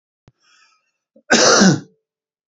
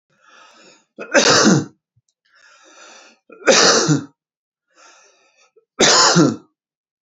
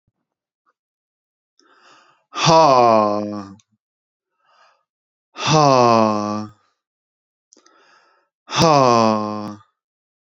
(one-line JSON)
{"cough_length": "2.5 s", "cough_amplitude": 29958, "cough_signal_mean_std_ratio": 0.37, "three_cough_length": "7.1 s", "three_cough_amplitude": 32102, "three_cough_signal_mean_std_ratio": 0.41, "exhalation_length": "10.3 s", "exhalation_amplitude": 30671, "exhalation_signal_mean_std_ratio": 0.38, "survey_phase": "beta (2021-08-13 to 2022-03-07)", "age": "18-44", "gender": "Male", "wearing_mask": "No", "symptom_none": true, "smoker_status": "Never smoked", "respiratory_condition_asthma": true, "respiratory_condition_other": false, "recruitment_source": "REACT", "submission_delay": "1 day", "covid_test_result": "Negative", "covid_test_method": "RT-qPCR"}